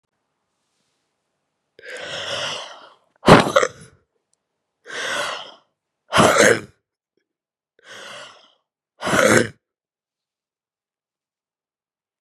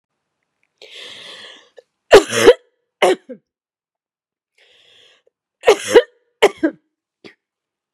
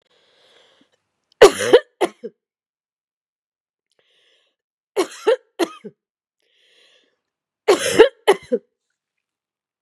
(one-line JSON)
{"exhalation_length": "12.2 s", "exhalation_amplitude": 32768, "exhalation_signal_mean_std_ratio": 0.29, "cough_length": "7.9 s", "cough_amplitude": 32768, "cough_signal_mean_std_ratio": 0.25, "three_cough_length": "9.8 s", "three_cough_amplitude": 32768, "three_cough_signal_mean_std_ratio": 0.23, "survey_phase": "beta (2021-08-13 to 2022-03-07)", "age": "45-64", "gender": "Female", "wearing_mask": "No", "symptom_cough_any": true, "symptom_new_continuous_cough": true, "symptom_runny_or_blocked_nose": true, "symptom_shortness_of_breath": true, "symptom_sore_throat": true, "symptom_fatigue": true, "symptom_headache": true, "symptom_onset": "7 days", "smoker_status": "Never smoked", "respiratory_condition_asthma": false, "respiratory_condition_other": false, "recruitment_source": "Test and Trace", "submission_delay": "0 days", "covid_test_result": "Positive", "covid_test_method": "RT-qPCR", "covid_ct_value": 20.5, "covid_ct_gene": "N gene", "covid_ct_mean": 21.3, "covid_viral_load": "100000 copies/ml", "covid_viral_load_category": "Low viral load (10K-1M copies/ml)"}